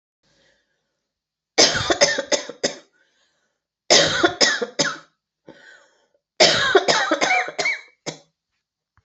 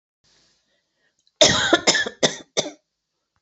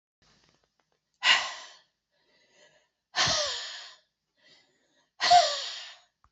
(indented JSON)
{
  "three_cough_length": "9.0 s",
  "three_cough_amplitude": 32768,
  "three_cough_signal_mean_std_ratio": 0.43,
  "cough_length": "3.4 s",
  "cough_amplitude": 28337,
  "cough_signal_mean_std_ratio": 0.35,
  "exhalation_length": "6.3 s",
  "exhalation_amplitude": 12984,
  "exhalation_signal_mean_std_ratio": 0.33,
  "survey_phase": "beta (2021-08-13 to 2022-03-07)",
  "age": "45-64",
  "gender": "Female",
  "wearing_mask": "No",
  "symptom_cough_any": true,
  "symptom_runny_or_blocked_nose": true,
  "symptom_shortness_of_breath": true,
  "symptom_sore_throat": true,
  "symptom_fatigue": true,
  "symptom_headache": true,
  "symptom_other": true,
  "smoker_status": "Never smoked",
  "respiratory_condition_asthma": false,
  "respiratory_condition_other": false,
  "recruitment_source": "Test and Trace",
  "submission_delay": "2 days",
  "covid_test_result": "Positive",
  "covid_test_method": "LFT"
}